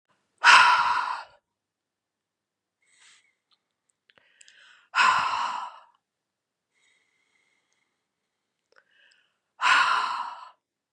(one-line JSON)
{"exhalation_length": "10.9 s", "exhalation_amplitude": 26652, "exhalation_signal_mean_std_ratio": 0.32, "survey_phase": "beta (2021-08-13 to 2022-03-07)", "age": "18-44", "gender": "Female", "wearing_mask": "No", "symptom_cough_any": true, "symptom_runny_or_blocked_nose": true, "symptom_sore_throat": true, "symptom_headache": true, "symptom_onset": "2 days", "smoker_status": "Never smoked", "respiratory_condition_asthma": false, "respiratory_condition_other": false, "recruitment_source": "Test and Trace", "submission_delay": "1 day", "covid_test_result": "Positive", "covid_test_method": "ePCR"}